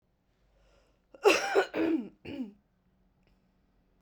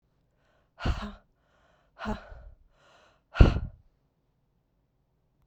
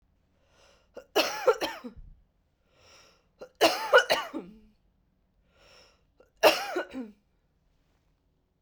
{
  "cough_length": "4.0 s",
  "cough_amplitude": 11639,
  "cough_signal_mean_std_ratio": 0.35,
  "exhalation_length": "5.5 s",
  "exhalation_amplitude": 28047,
  "exhalation_signal_mean_std_ratio": 0.2,
  "three_cough_length": "8.6 s",
  "three_cough_amplitude": 17035,
  "three_cough_signal_mean_std_ratio": 0.29,
  "survey_phase": "beta (2021-08-13 to 2022-03-07)",
  "age": "18-44",
  "gender": "Female",
  "wearing_mask": "No",
  "symptom_cough_any": true,
  "symptom_runny_or_blocked_nose": true,
  "symptom_shortness_of_breath": true,
  "symptom_sore_throat": true,
  "symptom_abdominal_pain": true,
  "symptom_headache": true,
  "symptom_change_to_sense_of_smell_or_taste": true,
  "symptom_loss_of_taste": true,
  "symptom_onset": "3 days",
  "smoker_status": "Current smoker (1 to 10 cigarettes per day)",
  "respiratory_condition_asthma": false,
  "respiratory_condition_other": false,
  "recruitment_source": "Test and Trace",
  "submission_delay": "1 day",
  "covid_test_result": "Positive",
  "covid_test_method": "RT-qPCR",
  "covid_ct_value": 14.6,
  "covid_ct_gene": "ORF1ab gene",
  "covid_ct_mean": 14.8,
  "covid_viral_load": "14000000 copies/ml",
  "covid_viral_load_category": "High viral load (>1M copies/ml)"
}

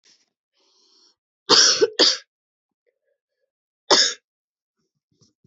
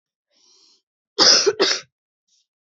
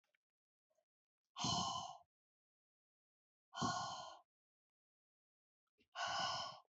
{
  "three_cough_length": "5.5 s",
  "three_cough_amplitude": 32767,
  "three_cough_signal_mean_std_ratio": 0.29,
  "cough_length": "2.7 s",
  "cough_amplitude": 32755,
  "cough_signal_mean_std_ratio": 0.34,
  "exhalation_length": "6.7 s",
  "exhalation_amplitude": 1497,
  "exhalation_signal_mean_std_ratio": 0.41,
  "survey_phase": "beta (2021-08-13 to 2022-03-07)",
  "age": "18-44",
  "wearing_mask": "No",
  "symptom_cough_any": true,
  "symptom_runny_or_blocked_nose": true,
  "symptom_shortness_of_breath": true,
  "symptom_diarrhoea": true,
  "symptom_headache": true,
  "symptom_onset": "1 day",
  "smoker_status": "Current smoker (1 to 10 cigarettes per day)",
  "respiratory_condition_asthma": false,
  "respiratory_condition_other": false,
  "recruitment_source": "Test and Trace",
  "submission_delay": "0 days",
  "covid_test_result": "Negative",
  "covid_test_method": "RT-qPCR"
}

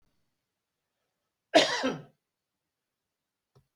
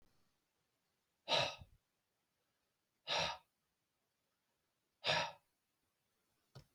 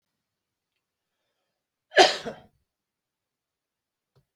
{
  "cough_length": "3.8 s",
  "cough_amplitude": 15826,
  "cough_signal_mean_std_ratio": 0.22,
  "exhalation_length": "6.7 s",
  "exhalation_amplitude": 2774,
  "exhalation_signal_mean_std_ratio": 0.27,
  "three_cough_length": "4.4 s",
  "three_cough_amplitude": 24045,
  "three_cough_signal_mean_std_ratio": 0.16,
  "survey_phase": "beta (2021-08-13 to 2022-03-07)",
  "age": "65+",
  "gender": "Male",
  "wearing_mask": "No",
  "symptom_cough_any": true,
  "symptom_shortness_of_breath": true,
  "smoker_status": "Ex-smoker",
  "respiratory_condition_asthma": false,
  "respiratory_condition_other": true,
  "recruitment_source": "REACT",
  "submission_delay": "1 day",
  "covid_test_result": "Negative",
  "covid_test_method": "RT-qPCR"
}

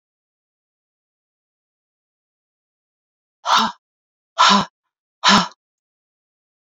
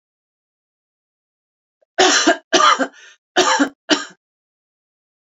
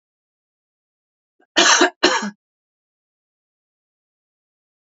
{
  "exhalation_length": "6.7 s",
  "exhalation_amplitude": 30302,
  "exhalation_signal_mean_std_ratio": 0.25,
  "three_cough_length": "5.2 s",
  "three_cough_amplitude": 32322,
  "three_cough_signal_mean_std_ratio": 0.37,
  "cough_length": "4.9 s",
  "cough_amplitude": 32680,
  "cough_signal_mean_std_ratio": 0.25,
  "survey_phase": "beta (2021-08-13 to 2022-03-07)",
  "age": "45-64",
  "gender": "Female",
  "wearing_mask": "No",
  "symptom_none": true,
  "smoker_status": "Never smoked",
  "respiratory_condition_asthma": false,
  "respiratory_condition_other": false,
  "recruitment_source": "REACT",
  "submission_delay": "2 days",
  "covid_test_result": "Negative",
  "covid_test_method": "RT-qPCR",
  "influenza_a_test_result": "Negative",
  "influenza_b_test_result": "Negative"
}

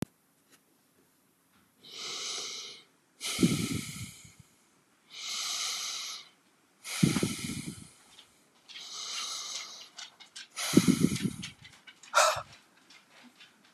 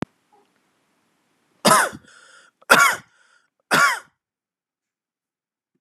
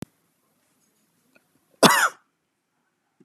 {
  "exhalation_length": "13.7 s",
  "exhalation_amplitude": 14580,
  "exhalation_signal_mean_std_ratio": 0.42,
  "three_cough_length": "5.8 s",
  "three_cough_amplitude": 32767,
  "three_cough_signal_mean_std_ratio": 0.28,
  "cough_length": "3.2 s",
  "cough_amplitude": 30518,
  "cough_signal_mean_std_ratio": 0.21,
  "survey_phase": "beta (2021-08-13 to 2022-03-07)",
  "age": "45-64",
  "gender": "Male",
  "wearing_mask": "No",
  "symptom_none": true,
  "smoker_status": "Ex-smoker",
  "respiratory_condition_asthma": false,
  "respiratory_condition_other": false,
  "recruitment_source": "REACT",
  "submission_delay": "2 days",
  "covid_test_result": "Negative",
  "covid_test_method": "RT-qPCR"
}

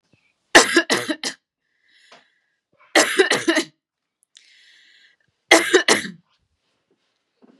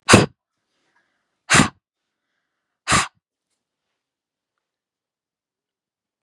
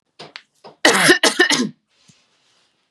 {
  "three_cough_length": "7.6 s",
  "three_cough_amplitude": 32768,
  "three_cough_signal_mean_std_ratio": 0.32,
  "exhalation_length": "6.2 s",
  "exhalation_amplitude": 32768,
  "exhalation_signal_mean_std_ratio": 0.21,
  "cough_length": "2.9 s",
  "cough_amplitude": 32768,
  "cough_signal_mean_std_ratio": 0.4,
  "survey_phase": "beta (2021-08-13 to 2022-03-07)",
  "age": "18-44",
  "gender": "Female",
  "wearing_mask": "No",
  "symptom_none": true,
  "smoker_status": "Never smoked",
  "respiratory_condition_asthma": true,
  "respiratory_condition_other": false,
  "recruitment_source": "REACT",
  "submission_delay": "1 day",
  "covid_test_result": "Negative",
  "covid_test_method": "RT-qPCR",
  "influenza_a_test_result": "Negative",
  "influenza_b_test_result": "Negative"
}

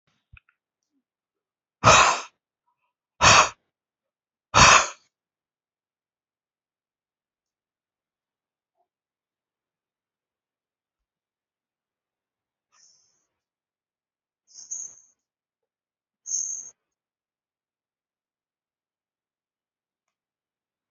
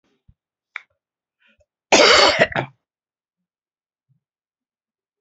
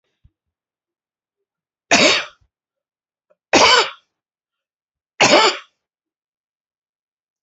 {
  "exhalation_length": "20.9 s",
  "exhalation_amplitude": 27627,
  "exhalation_signal_mean_std_ratio": 0.17,
  "cough_length": "5.2 s",
  "cough_amplitude": 32767,
  "cough_signal_mean_std_ratio": 0.27,
  "three_cough_length": "7.4 s",
  "three_cough_amplitude": 32768,
  "three_cough_signal_mean_std_ratio": 0.29,
  "survey_phase": "alpha (2021-03-01 to 2021-08-12)",
  "age": "65+",
  "gender": "Male",
  "wearing_mask": "No",
  "symptom_none": true,
  "smoker_status": "Never smoked",
  "respiratory_condition_asthma": false,
  "respiratory_condition_other": false,
  "recruitment_source": "REACT",
  "submission_delay": "1 day",
  "covid_test_result": "Negative",
  "covid_test_method": "RT-qPCR"
}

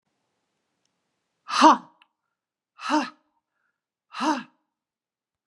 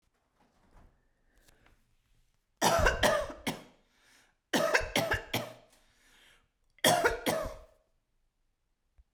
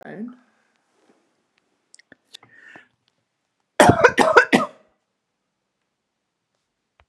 {
  "exhalation_length": "5.5 s",
  "exhalation_amplitude": 26757,
  "exhalation_signal_mean_std_ratio": 0.24,
  "three_cough_length": "9.1 s",
  "three_cough_amplitude": 9593,
  "three_cough_signal_mean_std_ratio": 0.38,
  "cough_length": "7.1 s",
  "cough_amplitude": 32768,
  "cough_signal_mean_std_ratio": 0.24,
  "survey_phase": "beta (2021-08-13 to 2022-03-07)",
  "age": "45-64",
  "gender": "Female",
  "wearing_mask": "No",
  "symptom_none": true,
  "smoker_status": "Never smoked",
  "respiratory_condition_asthma": false,
  "respiratory_condition_other": false,
  "recruitment_source": "REACT",
  "submission_delay": "1 day",
  "covid_test_result": "Negative",
  "covid_test_method": "RT-qPCR"
}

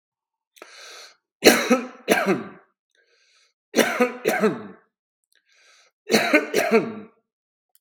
{
  "three_cough_length": "7.8 s",
  "three_cough_amplitude": 32768,
  "three_cough_signal_mean_std_ratio": 0.4,
  "survey_phase": "beta (2021-08-13 to 2022-03-07)",
  "age": "65+",
  "gender": "Male",
  "wearing_mask": "No",
  "symptom_none": true,
  "smoker_status": "Ex-smoker",
  "respiratory_condition_asthma": false,
  "respiratory_condition_other": false,
  "recruitment_source": "REACT",
  "submission_delay": "1 day",
  "covid_test_result": "Negative",
  "covid_test_method": "RT-qPCR",
  "influenza_a_test_result": "Negative",
  "influenza_b_test_result": "Negative"
}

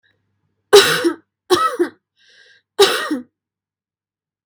{
  "three_cough_length": "4.5 s",
  "three_cough_amplitude": 32768,
  "three_cough_signal_mean_std_ratio": 0.36,
  "survey_phase": "beta (2021-08-13 to 2022-03-07)",
  "age": "18-44",
  "gender": "Female",
  "wearing_mask": "No",
  "symptom_none": true,
  "smoker_status": "Never smoked",
  "respiratory_condition_asthma": true,
  "respiratory_condition_other": false,
  "recruitment_source": "REACT",
  "submission_delay": "4 days",
  "covid_test_result": "Negative",
  "covid_test_method": "RT-qPCR",
  "influenza_a_test_result": "Negative",
  "influenza_b_test_result": "Negative"
}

